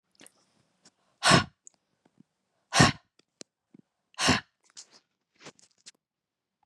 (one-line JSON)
{"exhalation_length": "6.7 s", "exhalation_amplitude": 20185, "exhalation_signal_mean_std_ratio": 0.23, "survey_phase": "beta (2021-08-13 to 2022-03-07)", "age": "45-64", "gender": "Female", "wearing_mask": "No", "symptom_none": true, "smoker_status": "Ex-smoker", "respiratory_condition_asthma": false, "respiratory_condition_other": false, "recruitment_source": "REACT", "submission_delay": "1 day", "covid_test_result": "Negative", "covid_test_method": "RT-qPCR", "influenza_a_test_result": "Negative", "influenza_b_test_result": "Negative"}